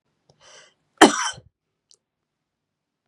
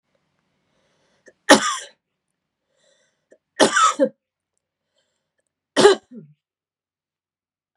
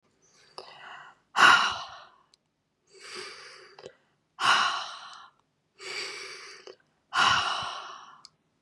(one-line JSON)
{"cough_length": "3.1 s", "cough_amplitude": 32768, "cough_signal_mean_std_ratio": 0.18, "three_cough_length": "7.8 s", "three_cough_amplitude": 32768, "three_cough_signal_mean_std_ratio": 0.24, "exhalation_length": "8.6 s", "exhalation_amplitude": 19762, "exhalation_signal_mean_std_ratio": 0.36, "survey_phase": "beta (2021-08-13 to 2022-03-07)", "age": "18-44", "gender": "Female", "wearing_mask": "No", "symptom_none": true, "symptom_onset": "12 days", "smoker_status": "Never smoked", "respiratory_condition_asthma": true, "respiratory_condition_other": false, "recruitment_source": "REACT", "submission_delay": "2 days", "covid_test_result": "Negative", "covid_test_method": "RT-qPCR", "influenza_a_test_result": "Negative", "influenza_b_test_result": "Negative"}